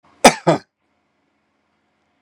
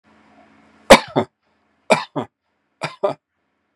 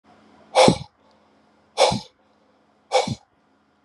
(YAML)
cough_length: 2.2 s
cough_amplitude: 32768
cough_signal_mean_std_ratio: 0.21
three_cough_length: 3.8 s
three_cough_amplitude: 32768
three_cough_signal_mean_std_ratio: 0.23
exhalation_length: 3.8 s
exhalation_amplitude: 31840
exhalation_signal_mean_std_ratio: 0.31
survey_phase: beta (2021-08-13 to 2022-03-07)
age: 45-64
gender: Male
wearing_mask: 'No'
symptom_sore_throat: true
smoker_status: Ex-smoker
respiratory_condition_asthma: false
respiratory_condition_other: false
recruitment_source: REACT
submission_delay: 1 day
covid_test_result: Negative
covid_test_method: RT-qPCR
influenza_a_test_result: Negative
influenza_b_test_result: Negative